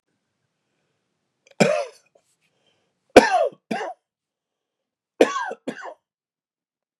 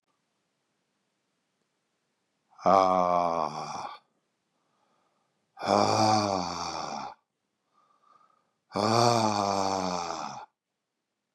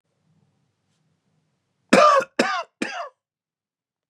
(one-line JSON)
{"three_cough_length": "7.0 s", "three_cough_amplitude": 32768, "three_cough_signal_mean_std_ratio": 0.24, "exhalation_length": "11.3 s", "exhalation_amplitude": 14986, "exhalation_signal_mean_std_ratio": 0.42, "cough_length": "4.1 s", "cough_amplitude": 32094, "cough_signal_mean_std_ratio": 0.3, "survey_phase": "beta (2021-08-13 to 2022-03-07)", "age": "65+", "gender": "Male", "wearing_mask": "No", "symptom_cough_any": true, "symptom_runny_or_blocked_nose": true, "smoker_status": "Never smoked", "respiratory_condition_asthma": false, "respiratory_condition_other": false, "recruitment_source": "REACT", "submission_delay": "1 day", "covid_test_result": "Negative", "covid_test_method": "RT-qPCR", "influenza_a_test_result": "Negative", "influenza_b_test_result": "Negative"}